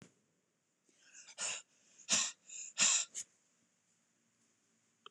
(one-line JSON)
{"exhalation_length": "5.1 s", "exhalation_amplitude": 5405, "exhalation_signal_mean_std_ratio": 0.31, "survey_phase": "beta (2021-08-13 to 2022-03-07)", "age": "45-64", "gender": "Female", "wearing_mask": "No", "symptom_none": true, "smoker_status": "Ex-smoker", "respiratory_condition_asthma": false, "respiratory_condition_other": false, "recruitment_source": "REACT", "submission_delay": "2 days", "covid_test_result": "Negative", "covid_test_method": "RT-qPCR", "influenza_a_test_result": "Negative", "influenza_b_test_result": "Negative"}